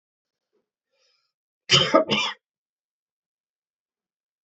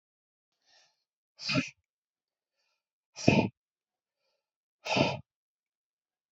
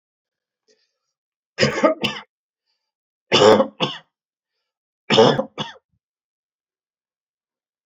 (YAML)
cough_length: 4.4 s
cough_amplitude: 26260
cough_signal_mean_std_ratio: 0.25
exhalation_length: 6.3 s
exhalation_amplitude: 17264
exhalation_signal_mean_std_ratio: 0.25
three_cough_length: 7.9 s
three_cough_amplitude: 28512
three_cough_signal_mean_std_ratio: 0.29
survey_phase: alpha (2021-03-01 to 2021-08-12)
age: 45-64
gender: Male
wearing_mask: 'No'
symptom_none: true
smoker_status: Never smoked
respiratory_condition_asthma: false
respiratory_condition_other: false
recruitment_source: REACT
submission_delay: 1 day
covid_test_result: Negative
covid_test_method: RT-qPCR